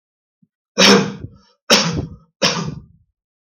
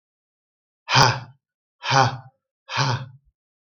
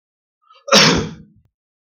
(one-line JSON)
{"three_cough_length": "3.4 s", "three_cough_amplitude": 32768, "three_cough_signal_mean_std_ratio": 0.41, "exhalation_length": "3.8 s", "exhalation_amplitude": 32766, "exhalation_signal_mean_std_ratio": 0.37, "cough_length": "1.9 s", "cough_amplitude": 32768, "cough_signal_mean_std_ratio": 0.36, "survey_phase": "beta (2021-08-13 to 2022-03-07)", "age": "45-64", "gender": "Male", "wearing_mask": "No", "symptom_none": true, "smoker_status": "Never smoked", "respiratory_condition_asthma": false, "respiratory_condition_other": false, "recruitment_source": "REACT", "submission_delay": "2 days", "covid_test_result": "Negative", "covid_test_method": "RT-qPCR", "influenza_a_test_result": "Negative", "influenza_b_test_result": "Negative"}